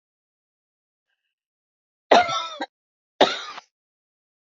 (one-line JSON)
{"cough_length": "4.4 s", "cough_amplitude": 26790, "cough_signal_mean_std_ratio": 0.24, "survey_phase": "beta (2021-08-13 to 2022-03-07)", "age": "45-64", "gender": "Female", "wearing_mask": "No", "symptom_none": true, "smoker_status": "Never smoked", "respiratory_condition_asthma": false, "respiratory_condition_other": false, "recruitment_source": "REACT", "submission_delay": "2 days", "covid_test_result": "Negative", "covid_test_method": "RT-qPCR"}